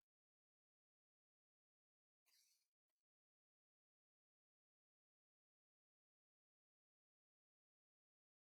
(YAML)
three_cough_length: 8.5 s
three_cough_amplitude: 16
three_cough_signal_mean_std_ratio: 0.15
survey_phase: beta (2021-08-13 to 2022-03-07)
age: 65+
gender: Female
wearing_mask: 'No'
symptom_cough_any: true
symptom_shortness_of_breath: true
symptom_fatigue: true
symptom_headache: true
symptom_onset: 12 days
smoker_status: Never smoked
respiratory_condition_asthma: false
respiratory_condition_other: true
recruitment_source: REACT
submission_delay: 1 day
covid_test_result: Negative
covid_test_method: RT-qPCR